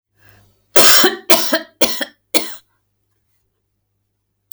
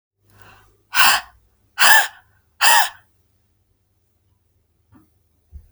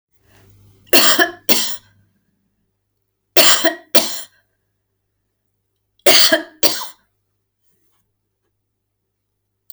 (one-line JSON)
{"cough_length": "4.5 s", "cough_amplitude": 32768, "cough_signal_mean_std_ratio": 0.35, "exhalation_length": "5.7 s", "exhalation_amplitude": 32768, "exhalation_signal_mean_std_ratio": 0.3, "three_cough_length": "9.7 s", "three_cough_amplitude": 32768, "three_cough_signal_mean_std_ratio": 0.31, "survey_phase": "alpha (2021-03-01 to 2021-08-12)", "age": "65+", "gender": "Female", "wearing_mask": "No", "symptom_none": true, "smoker_status": "Never smoked", "respiratory_condition_asthma": false, "respiratory_condition_other": false, "recruitment_source": "REACT", "submission_delay": "1 day", "covid_test_result": "Negative", "covid_test_method": "RT-qPCR"}